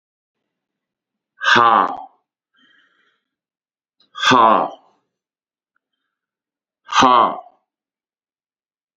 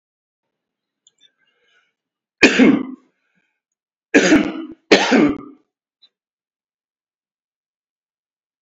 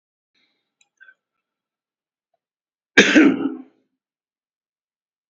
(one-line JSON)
{"exhalation_length": "9.0 s", "exhalation_amplitude": 32768, "exhalation_signal_mean_std_ratio": 0.31, "three_cough_length": "8.6 s", "three_cough_amplitude": 32363, "three_cough_signal_mean_std_ratio": 0.3, "cough_length": "5.3 s", "cough_amplitude": 30885, "cough_signal_mean_std_ratio": 0.23, "survey_phase": "beta (2021-08-13 to 2022-03-07)", "age": "65+", "gender": "Male", "wearing_mask": "No", "symptom_none": true, "smoker_status": "Current smoker (11 or more cigarettes per day)", "respiratory_condition_asthma": false, "respiratory_condition_other": false, "recruitment_source": "REACT", "submission_delay": "2 days", "covid_test_result": "Negative", "covid_test_method": "RT-qPCR", "influenza_a_test_result": "Negative", "influenza_b_test_result": "Negative"}